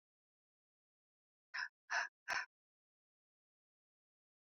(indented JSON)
{
  "exhalation_length": "4.5 s",
  "exhalation_amplitude": 1426,
  "exhalation_signal_mean_std_ratio": 0.24,
  "survey_phase": "alpha (2021-03-01 to 2021-08-12)",
  "age": "18-44",
  "gender": "Female",
  "wearing_mask": "No",
  "symptom_cough_any": true,
  "symptom_headache": true,
  "smoker_status": "Never smoked",
  "respiratory_condition_asthma": false,
  "respiratory_condition_other": false,
  "recruitment_source": "Test and Trace",
  "submission_delay": "2 days",
  "covid_test_result": "Positive",
  "covid_test_method": "RT-qPCR"
}